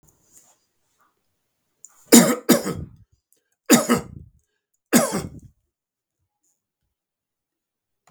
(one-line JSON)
{"three_cough_length": "8.1 s", "three_cough_amplitude": 32768, "three_cough_signal_mean_std_ratio": 0.25, "survey_phase": "beta (2021-08-13 to 2022-03-07)", "age": "65+", "gender": "Male", "wearing_mask": "No", "symptom_none": true, "smoker_status": "Ex-smoker", "respiratory_condition_asthma": false, "respiratory_condition_other": false, "recruitment_source": "REACT", "submission_delay": "1 day", "covid_test_result": "Negative", "covid_test_method": "RT-qPCR", "influenza_a_test_result": "Negative", "influenza_b_test_result": "Negative"}